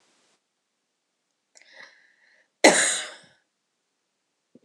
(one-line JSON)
{"cough_length": "4.6 s", "cough_amplitude": 26028, "cough_signal_mean_std_ratio": 0.2, "survey_phase": "alpha (2021-03-01 to 2021-08-12)", "age": "18-44", "gender": "Female", "wearing_mask": "No", "symptom_none": true, "symptom_onset": "5 days", "smoker_status": "Never smoked", "respiratory_condition_asthma": false, "respiratory_condition_other": false, "recruitment_source": "REACT", "submission_delay": "3 days", "covid_test_result": "Negative", "covid_test_method": "RT-qPCR"}